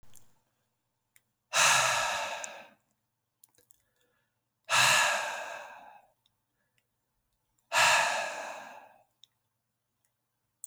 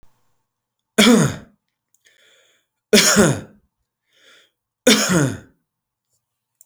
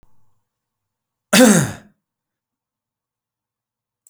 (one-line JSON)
{"exhalation_length": "10.7 s", "exhalation_amplitude": 9356, "exhalation_signal_mean_std_ratio": 0.38, "three_cough_length": "6.7 s", "three_cough_amplitude": 31983, "three_cough_signal_mean_std_ratio": 0.35, "cough_length": "4.1 s", "cough_amplitude": 32768, "cough_signal_mean_std_ratio": 0.24, "survey_phase": "beta (2021-08-13 to 2022-03-07)", "age": "45-64", "gender": "Male", "wearing_mask": "No", "symptom_none": true, "smoker_status": "Ex-smoker", "respiratory_condition_asthma": false, "respiratory_condition_other": false, "recruitment_source": "REACT", "submission_delay": "1 day", "covid_test_result": "Negative", "covid_test_method": "RT-qPCR"}